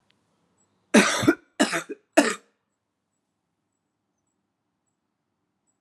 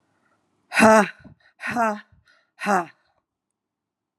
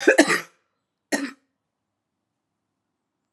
{"three_cough_length": "5.8 s", "three_cough_amplitude": 23972, "three_cough_signal_mean_std_ratio": 0.25, "exhalation_length": "4.2 s", "exhalation_amplitude": 31362, "exhalation_signal_mean_std_ratio": 0.31, "cough_length": "3.3 s", "cough_amplitude": 32022, "cough_signal_mean_std_ratio": 0.25, "survey_phase": "alpha (2021-03-01 to 2021-08-12)", "age": "45-64", "gender": "Female", "wearing_mask": "No", "symptom_fatigue": true, "symptom_headache": true, "symptom_change_to_sense_of_smell_or_taste": true, "symptom_loss_of_taste": true, "symptom_onset": "5 days", "smoker_status": "Ex-smoker", "respiratory_condition_asthma": false, "respiratory_condition_other": false, "recruitment_source": "Test and Trace", "submission_delay": "2 days", "covid_test_result": "Positive", "covid_test_method": "RT-qPCR"}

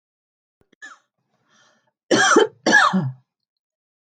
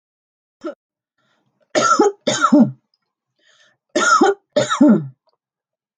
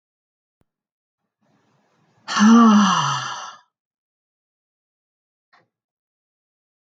{"cough_length": "4.0 s", "cough_amplitude": 24281, "cough_signal_mean_std_ratio": 0.37, "three_cough_length": "6.0 s", "three_cough_amplitude": 27167, "three_cough_signal_mean_std_ratio": 0.42, "exhalation_length": "7.0 s", "exhalation_amplitude": 24379, "exhalation_signal_mean_std_ratio": 0.3, "survey_phase": "beta (2021-08-13 to 2022-03-07)", "age": "65+", "gender": "Female", "wearing_mask": "No", "symptom_none": true, "smoker_status": "Never smoked", "respiratory_condition_asthma": false, "respiratory_condition_other": false, "recruitment_source": "Test and Trace", "submission_delay": "2 days", "covid_test_result": "Negative", "covid_test_method": "LFT"}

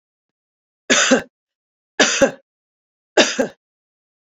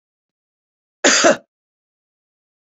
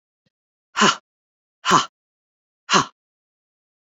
{"three_cough_length": "4.4 s", "three_cough_amplitude": 30777, "three_cough_signal_mean_std_ratio": 0.33, "cough_length": "2.6 s", "cough_amplitude": 28772, "cough_signal_mean_std_ratio": 0.27, "exhalation_length": "3.9 s", "exhalation_amplitude": 26720, "exhalation_signal_mean_std_ratio": 0.27, "survey_phase": "beta (2021-08-13 to 2022-03-07)", "age": "65+", "gender": "Female", "wearing_mask": "No", "symptom_none": true, "smoker_status": "Ex-smoker", "respiratory_condition_asthma": false, "respiratory_condition_other": false, "recruitment_source": "REACT", "submission_delay": "1 day", "covid_test_result": "Negative", "covid_test_method": "RT-qPCR", "influenza_a_test_result": "Negative", "influenza_b_test_result": "Negative"}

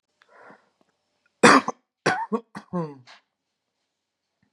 {"cough_length": "4.5 s", "cough_amplitude": 32329, "cough_signal_mean_std_ratio": 0.24, "survey_phase": "beta (2021-08-13 to 2022-03-07)", "age": "18-44", "gender": "Male", "wearing_mask": "No", "symptom_none": true, "smoker_status": "Current smoker (1 to 10 cigarettes per day)", "respiratory_condition_asthma": false, "respiratory_condition_other": false, "recruitment_source": "REACT", "submission_delay": "1 day", "covid_test_result": "Negative", "covid_test_method": "RT-qPCR", "influenza_a_test_result": "Unknown/Void", "influenza_b_test_result": "Unknown/Void"}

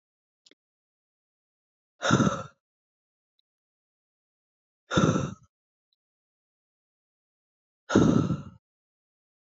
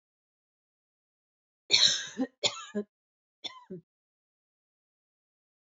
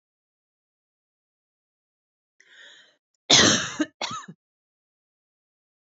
{"exhalation_length": "9.5 s", "exhalation_amplitude": 14919, "exhalation_signal_mean_std_ratio": 0.27, "three_cough_length": "5.7 s", "three_cough_amplitude": 18266, "three_cough_signal_mean_std_ratio": 0.25, "cough_length": "6.0 s", "cough_amplitude": 29465, "cough_signal_mean_std_ratio": 0.22, "survey_phase": "alpha (2021-03-01 to 2021-08-12)", "age": "45-64", "gender": "Female", "wearing_mask": "No", "symptom_none": true, "smoker_status": "Never smoked", "respiratory_condition_asthma": false, "respiratory_condition_other": false, "recruitment_source": "REACT", "submission_delay": "2 days", "covid_test_result": "Negative", "covid_test_method": "RT-qPCR"}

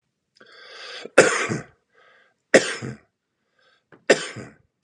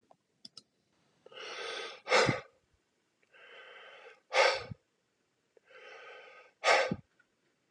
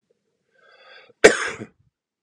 {"three_cough_length": "4.8 s", "three_cough_amplitude": 32768, "three_cough_signal_mean_std_ratio": 0.28, "exhalation_length": "7.7 s", "exhalation_amplitude": 8952, "exhalation_signal_mean_std_ratio": 0.32, "cough_length": "2.2 s", "cough_amplitude": 32768, "cough_signal_mean_std_ratio": 0.2, "survey_phase": "beta (2021-08-13 to 2022-03-07)", "age": "45-64", "gender": "Male", "wearing_mask": "No", "symptom_none": true, "smoker_status": "Ex-smoker", "respiratory_condition_asthma": false, "respiratory_condition_other": false, "recruitment_source": "REACT", "submission_delay": "2 days", "covid_test_result": "Negative", "covid_test_method": "RT-qPCR", "influenza_a_test_result": "Negative", "influenza_b_test_result": "Negative"}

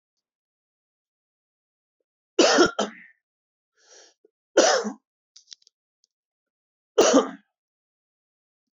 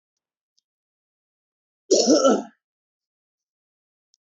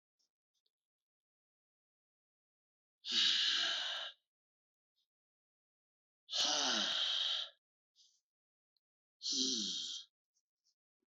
{"three_cough_length": "8.8 s", "three_cough_amplitude": 20949, "three_cough_signal_mean_std_ratio": 0.26, "cough_length": "4.3 s", "cough_amplitude": 18819, "cough_signal_mean_std_ratio": 0.27, "exhalation_length": "11.2 s", "exhalation_amplitude": 3252, "exhalation_signal_mean_std_ratio": 0.42, "survey_phase": "beta (2021-08-13 to 2022-03-07)", "age": "45-64", "gender": "Male", "wearing_mask": "No", "symptom_cough_any": true, "symptom_new_continuous_cough": true, "symptom_runny_or_blocked_nose": true, "symptom_sore_throat": true, "symptom_change_to_sense_of_smell_or_taste": true, "smoker_status": "Never smoked", "respiratory_condition_asthma": false, "respiratory_condition_other": false, "recruitment_source": "REACT", "submission_delay": "1 day", "covid_test_result": "Negative", "covid_test_method": "RT-qPCR"}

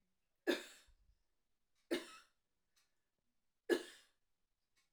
{"three_cough_length": "4.9 s", "three_cough_amplitude": 2746, "three_cough_signal_mean_std_ratio": 0.23, "survey_phase": "alpha (2021-03-01 to 2021-08-12)", "age": "45-64", "gender": "Female", "wearing_mask": "No", "symptom_none": true, "smoker_status": "Ex-smoker", "respiratory_condition_asthma": true, "respiratory_condition_other": false, "recruitment_source": "REACT", "submission_delay": "1 day", "covid_test_result": "Negative", "covid_test_method": "RT-qPCR"}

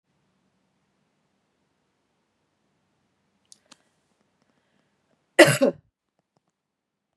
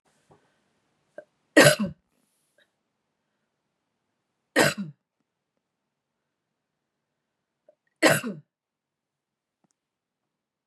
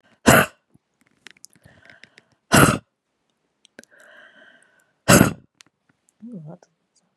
{"cough_length": "7.2 s", "cough_amplitude": 32385, "cough_signal_mean_std_ratio": 0.14, "three_cough_length": "10.7 s", "three_cough_amplitude": 23806, "three_cough_signal_mean_std_ratio": 0.19, "exhalation_length": "7.2 s", "exhalation_amplitude": 32768, "exhalation_signal_mean_std_ratio": 0.24, "survey_phase": "beta (2021-08-13 to 2022-03-07)", "age": "18-44", "gender": "Female", "wearing_mask": "No", "symptom_runny_or_blocked_nose": true, "symptom_sore_throat": true, "symptom_change_to_sense_of_smell_or_taste": true, "symptom_onset": "3 days", "smoker_status": "Never smoked", "respiratory_condition_asthma": true, "respiratory_condition_other": false, "recruitment_source": "Test and Trace", "submission_delay": "1 day", "covid_test_result": "Positive", "covid_test_method": "RT-qPCR", "covid_ct_value": 25.1, "covid_ct_gene": "N gene"}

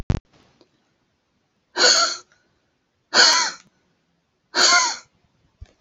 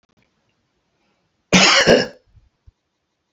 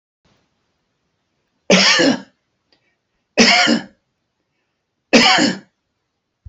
{"exhalation_length": "5.8 s", "exhalation_amplitude": 29577, "exhalation_signal_mean_std_ratio": 0.36, "cough_length": "3.3 s", "cough_amplitude": 31710, "cough_signal_mean_std_ratio": 0.32, "three_cough_length": "6.5 s", "three_cough_amplitude": 32638, "three_cough_signal_mean_std_ratio": 0.37, "survey_phase": "beta (2021-08-13 to 2022-03-07)", "age": "65+", "gender": "Male", "wearing_mask": "No", "symptom_none": true, "smoker_status": "Ex-smoker", "respiratory_condition_asthma": false, "respiratory_condition_other": false, "recruitment_source": "REACT", "submission_delay": "3 days", "covid_test_result": "Negative", "covid_test_method": "RT-qPCR"}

